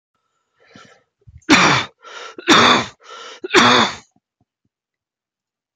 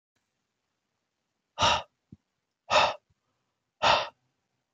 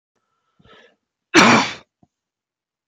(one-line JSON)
{"three_cough_length": "5.8 s", "three_cough_amplitude": 32621, "three_cough_signal_mean_std_ratio": 0.38, "exhalation_length": "4.7 s", "exhalation_amplitude": 13140, "exhalation_signal_mean_std_ratio": 0.29, "cough_length": "2.9 s", "cough_amplitude": 31952, "cough_signal_mean_std_ratio": 0.28, "survey_phase": "beta (2021-08-13 to 2022-03-07)", "age": "18-44", "gender": "Male", "wearing_mask": "No", "symptom_cough_any": true, "symptom_fatigue": true, "symptom_fever_high_temperature": true, "symptom_headache": true, "symptom_change_to_sense_of_smell_or_taste": true, "symptom_loss_of_taste": true, "smoker_status": "Ex-smoker", "respiratory_condition_asthma": false, "respiratory_condition_other": false, "recruitment_source": "Test and Trace", "submission_delay": "1 day", "covid_test_result": "Positive", "covid_test_method": "ePCR"}